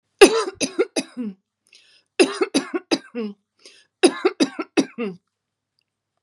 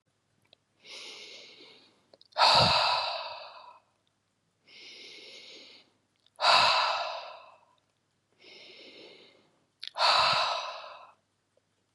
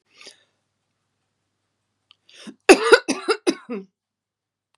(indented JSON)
{
  "three_cough_length": "6.2 s",
  "three_cough_amplitude": 32767,
  "three_cough_signal_mean_std_ratio": 0.34,
  "exhalation_length": "11.9 s",
  "exhalation_amplitude": 12157,
  "exhalation_signal_mean_std_ratio": 0.39,
  "cough_length": "4.8 s",
  "cough_amplitude": 32768,
  "cough_signal_mean_std_ratio": 0.22,
  "survey_phase": "beta (2021-08-13 to 2022-03-07)",
  "age": "65+",
  "gender": "Female",
  "wearing_mask": "No",
  "symptom_none": true,
  "smoker_status": "Ex-smoker",
  "respiratory_condition_asthma": false,
  "respiratory_condition_other": false,
  "recruitment_source": "REACT",
  "submission_delay": "2 days",
  "covid_test_result": "Negative",
  "covid_test_method": "RT-qPCR",
  "influenza_a_test_result": "Negative",
  "influenza_b_test_result": "Negative"
}